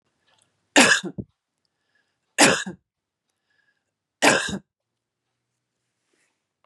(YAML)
three_cough_length: 6.7 s
three_cough_amplitude: 29202
three_cough_signal_mean_std_ratio: 0.26
survey_phase: beta (2021-08-13 to 2022-03-07)
age: 45-64
gender: Female
wearing_mask: 'No'
symptom_none: true
smoker_status: Ex-smoker
respiratory_condition_asthma: false
respiratory_condition_other: false
recruitment_source: REACT
submission_delay: 1 day
covid_test_result: Negative
covid_test_method: RT-qPCR
influenza_a_test_result: Negative
influenza_b_test_result: Negative